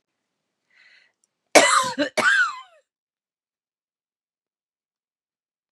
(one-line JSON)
{"cough_length": "5.7 s", "cough_amplitude": 32767, "cough_signal_mean_std_ratio": 0.28, "survey_phase": "beta (2021-08-13 to 2022-03-07)", "age": "45-64", "gender": "Female", "wearing_mask": "No", "symptom_cough_any": true, "symptom_sore_throat": true, "symptom_onset": "3 days", "smoker_status": "Ex-smoker", "respiratory_condition_asthma": false, "respiratory_condition_other": false, "recruitment_source": "Test and Trace", "submission_delay": "2 days", "covid_test_result": "Negative", "covid_test_method": "RT-qPCR"}